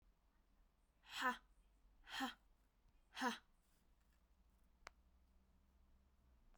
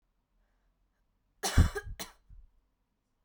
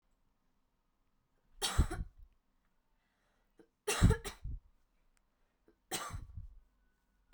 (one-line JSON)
{"exhalation_length": "6.6 s", "exhalation_amplitude": 1132, "exhalation_signal_mean_std_ratio": 0.3, "cough_length": "3.2 s", "cough_amplitude": 10329, "cough_signal_mean_std_ratio": 0.24, "three_cough_length": "7.3 s", "three_cough_amplitude": 5864, "three_cough_signal_mean_std_ratio": 0.27, "survey_phase": "beta (2021-08-13 to 2022-03-07)", "age": "18-44", "gender": "Female", "wearing_mask": "No", "symptom_runny_or_blocked_nose": true, "symptom_headache": true, "symptom_change_to_sense_of_smell_or_taste": true, "symptom_loss_of_taste": true, "symptom_onset": "7 days", "smoker_status": "Never smoked", "respiratory_condition_asthma": false, "respiratory_condition_other": false, "recruitment_source": "Test and Trace", "submission_delay": "2 days", "covid_test_result": "Positive", "covid_test_method": "RT-qPCR", "covid_ct_value": 19.6, "covid_ct_gene": "ORF1ab gene", "covid_ct_mean": 19.9, "covid_viral_load": "290000 copies/ml", "covid_viral_load_category": "Low viral load (10K-1M copies/ml)"}